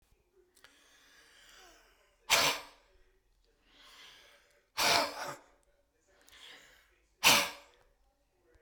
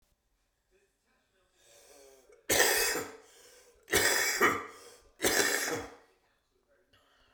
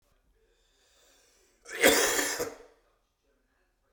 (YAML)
exhalation_length: 8.6 s
exhalation_amplitude: 9307
exhalation_signal_mean_std_ratio: 0.28
three_cough_length: 7.3 s
three_cough_amplitude: 10414
three_cough_signal_mean_std_ratio: 0.42
cough_length: 3.9 s
cough_amplitude: 13678
cough_signal_mean_std_ratio: 0.32
survey_phase: beta (2021-08-13 to 2022-03-07)
age: 45-64
gender: Male
wearing_mask: 'No'
symptom_none: true
symptom_onset: 11 days
smoker_status: Never smoked
respiratory_condition_asthma: true
respiratory_condition_other: false
recruitment_source: REACT
submission_delay: 0 days
covid_test_result: Negative
covid_test_method: RT-qPCR
influenza_a_test_result: Negative
influenza_b_test_result: Negative